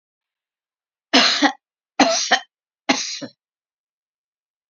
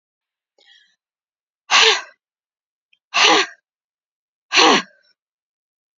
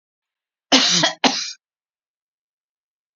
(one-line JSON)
{"three_cough_length": "4.7 s", "three_cough_amplitude": 30145, "three_cough_signal_mean_std_ratio": 0.34, "exhalation_length": "6.0 s", "exhalation_amplitude": 32768, "exhalation_signal_mean_std_ratio": 0.31, "cough_length": "3.2 s", "cough_amplitude": 32768, "cough_signal_mean_std_ratio": 0.33, "survey_phase": "beta (2021-08-13 to 2022-03-07)", "age": "65+", "gender": "Female", "wearing_mask": "No", "symptom_none": true, "smoker_status": "Never smoked", "respiratory_condition_asthma": false, "respiratory_condition_other": false, "recruitment_source": "REACT", "submission_delay": "1 day", "covid_test_result": "Negative", "covid_test_method": "RT-qPCR", "influenza_a_test_result": "Unknown/Void", "influenza_b_test_result": "Unknown/Void"}